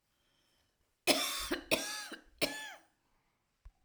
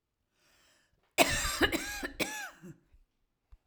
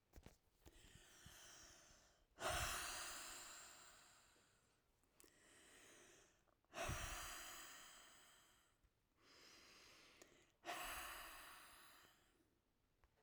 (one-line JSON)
{"three_cough_length": "3.8 s", "three_cough_amplitude": 7748, "three_cough_signal_mean_std_ratio": 0.39, "cough_length": "3.7 s", "cough_amplitude": 12722, "cough_signal_mean_std_ratio": 0.38, "exhalation_length": "13.2 s", "exhalation_amplitude": 764, "exhalation_signal_mean_std_ratio": 0.51, "survey_phase": "alpha (2021-03-01 to 2021-08-12)", "age": "45-64", "gender": "Female", "wearing_mask": "No", "symptom_none": true, "smoker_status": "Ex-smoker", "respiratory_condition_asthma": false, "respiratory_condition_other": false, "recruitment_source": "REACT", "submission_delay": "1 day", "covid_test_result": "Negative", "covid_test_method": "RT-qPCR"}